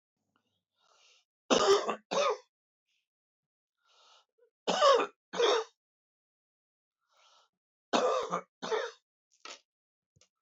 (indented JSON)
{
  "three_cough_length": "10.4 s",
  "three_cough_amplitude": 9067,
  "three_cough_signal_mean_std_ratio": 0.34,
  "survey_phase": "beta (2021-08-13 to 2022-03-07)",
  "age": "65+",
  "gender": "Male",
  "wearing_mask": "No",
  "symptom_none": true,
  "smoker_status": "Ex-smoker",
  "respiratory_condition_asthma": false,
  "respiratory_condition_other": false,
  "recruitment_source": "REACT",
  "submission_delay": "5 days",
  "covid_test_result": "Negative",
  "covid_test_method": "RT-qPCR"
}